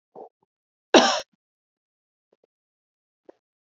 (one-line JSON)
{"cough_length": "3.7 s", "cough_amplitude": 28535, "cough_signal_mean_std_ratio": 0.18, "survey_phase": "beta (2021-08-13 to 2022-03-07)", "age": "45-64", "gender": "Female", "wearing_mask": "No", "symptom_cough_any": true, "symptom_runny_or_blocked_nose": true, "symptom_fatigue": true, "symptom_headache": true, "symptom_change_to_sense_of_smell_or_taste": true, "symptom_onset": "3 days", "smoker_status": "Never smoked", "respiratory_condition_asthma": false, "respiratory_condition_other": false, "recruitment_source": "Test and Trace", "submission_delay": "2 days", "covid_test_result": "Positive", "covid_test_method": "RT-qPCR", "covid_ct_value": 17.1, "covid_ct_gene": "ORF1ab gene", "covid_ct_mean": 17.5, "covid_viral_load": "1800000 copies/ml", "covid_viral_load_category": "High viral load (>1M copies/ml)"}